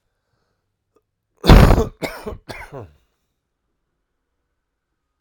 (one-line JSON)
{"cough_length": "5.2 s", "cough_amplitude": 32768, "cough_signal_mean_std_ratio": 0.23, "survey_phase": "alpha (2021-03-01 to 2021-08-12)", "age": "45-64", "gender": "Male", "wearing_mask": "No", "symptom_cough_any": true, "symptom_shortness_of_breath": true, "symptom_fatigue": true, "symptom_headache": true, "symptom_onset": "5 days", "smoker_status": "Ex-smoker", "respiratory_condition_asthma": false, "respiratory_condition_other": false, "recruitment_source": "Test and Trace", "submission_delay": "2 days", "covid_test_result": "Positive", "covid_test_method": "RT-qPCR", "covid_ct_value": 24.6, "covid_ct_gene": "ORF1ab gene"}